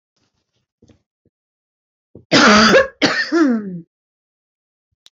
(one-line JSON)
{"cough_length": "5.1 s", "cough_amplitude": 29001, "cough_signal_mean_std_ratio": 0.4, "survey_phase": "alpha (2021-03-01 to 2021-08-12)", "age": "45-64", "gender": "Female", "wearing_mask": "No", "symptom_none": true, "smoker_status": "Ex-smoker", "respiratory_condition_asthma": false, "respiratory_condition_other": false, "recruitment_source": "REACT", "submission_delay": "1 day", "covid_test_result": "Negative", "covid_test_method": "RT-qPCR"}